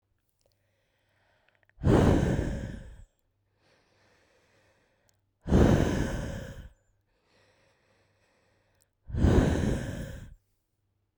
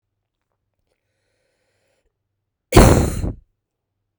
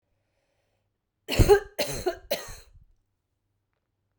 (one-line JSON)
{"exhalation_length": "11.2 s", "exhalation_amplitude": 13569, "exhalation_signal_mean_std_ratio": 0.38, "cough_length": "4.2 s", "cough_amplitude": 32768, "cough_signal_mean_std_ratio": 0.25, "three_cough_length": "4.2 s", "three_cough_amplitude": 16671, "three_cough_signal_mean_std_ratio": 0.27, "survey_phase": "beta (2021-08-13 to 2022-03-07)", "age": "18-44", "gender": "Female", "wearing_mask": "No", "symptom_cough_any": true, "symptom_runny_or_blocked_nose": true, "symptom_shortness_of_breath": true, "symptom_sore_throat": true, "symptom_fatigue": true, "symptom_headache": true, "symptom_change_to_sense_of_smell_or_taste": true, "symptom_loss_of_taste": true, "symptom_onset": "3 days", "smoker_status": "Never smoked", "respiratory_condition_asthma": false, "respiratory_condition_other": false, "recruitment_source": "Test and Trace", "submission_delay": "2 days", "covid_test_result": "Positive", "covid_test_method": "RT-qPCR"}